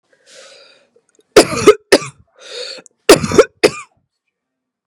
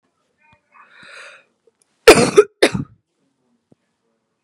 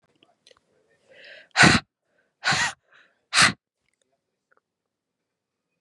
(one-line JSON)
{"three_cough_length": "4.9 s", "three_cough_amplitude": 32768, "three_cough_signal_mean_std_ratio": 0.3, "cough_length": "4.4 s", "cough_amplitude": 32768, "cough_signal_mean_std_ratio": 0.23, "exhalation_length": "5.8 s", "exhalation_amplitude": 28817, "exhalation_signal_mean_std_ratio": 0.25, "survey_phase": "beta (2021-08-13 to 2022-03-07)", "age": "18-44", "gender": "Female", "wearing_mask": "No", "symptom_cough_any": true, "symptom_new_continuous_cough": true, "symptom_runny_or_blocked_nose": true, "symptom_sore_throat": true, "symptom_abdominal_pain": true, "symptom_headache": true, "symptom_change_to_sense_of_smell_or_taste": true, "symptom_loss_of_taste": true, "symptom_onset": "4 days", "smoker_status": "Never smoked", "respiratory_condition_asthma": false, "respiratory_condition_other": false, "recruitment_source": "Test and Trace", "submission_delay": "2 days", "covid_test_result": "Positive", "covid_test_method": "RT-qPCR", "covid_ct_value": 23.1, "covid_ct_gene": "ORF1ab gene", "covid_ct_mean": 23.6, "covid_viral_load": "19000 copies/ml", "covid_viral_load_category": "Low viral load (10K-1M copies/ml)"}